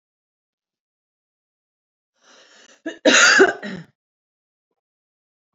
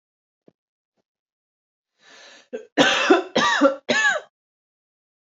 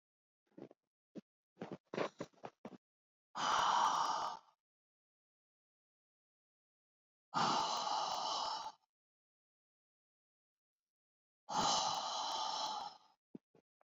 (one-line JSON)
{"cough_length": "5.5 s", "cough_amplitude": 28871, "cough_signal_mean_std_ratio": 0.26, "three_cough_length": "5.2 s", "three_cough_amplitude": 26008, "three_cough_signal_mean_std_ratio": 0.38, "exhalation_length": "14.0 s", "exhalation_amplitude": 2575, "exhalation_signal_mean_std_ratio": 0.44, "survey_phase": "beta (2021-08-13 to 2022-03-07)", "age": "18-44", "gender": "Female", "wearing_mask": "No", "symptom_runny_or_blocked_nose": true, "symptom_headache": true, "symptom_onset": "12 days", "smoker_status": "Ex-smoker", "respiratory_condition_asthma": false, "respiratory_condition_other": false, "recruitment_source": "REACT", "submission_delay": "1 day", "covid_test_result": "Negative", "covid_test_method": "RT-qPCR", "influenza_a_test_result": "Negative", "influenza_b_test_result": "Negative"}